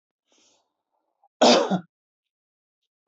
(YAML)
cough_length: 3.1 s
cough_amplitude: 19024
cough_signal_mean_std_ratio: 0.26
survey_phase: beta (2021-08-13 to 2022-03-07)
age: 45-64
gender: Male
wearing_mask: 'No'
symptom_none: true
smoker_status: Never smoked
respiratory_condition_asthma: false
respiratory_condition_other: false
recruitment_source: REACT
submission_delay: 2 days
covid_test_result: Negative
covid_test_method: RT-qPCR
influenza_a_test_result: Unknown/Void
influenza_b_test_result: Unknown/Void